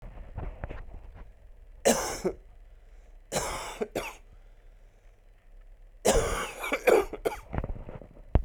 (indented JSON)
{
  "three_cough_length": "8.4 s",
  "three_cough_amplitude": 15117,
  "three_cough_signal_mean_std_ratio": 0.46,
  "survey_phase": "alpha (2021-03-01 to 2021-08-12)",
  "age": "18-44",
  "gender": "Male",
  "wearing_mask": "No",
  "symptom_cough_any": true,
  "symptom_fatigue": true,
  "symptom_fever_high_temperature": true,
  "symptom_headache": true,
  "symptom_change_to_sense_of_smell_or_taste": true,
  "symptom_loss_of_taste": true,
  "smoker_status": "Ex-smoker",
  "respiratory_condition_asthma": false,
  "respiratory_condition_other": false,
  "recruitment_source": "Test and Trace",
  "submission_delay": "2 days",
  "covid_test_result": "Positive",
  "covid_test_method": "RT-qPCR",
  "covid_ct_value": 28.9,
  "covid_ct_gene": "ORF1ab gene",
  "covid_ct_mean": 29.3,
  "covid_viral_load": "250 copies/ml",
  "covid_viral_load_category": "Minimal viral load (< 10K copies/ml)"
}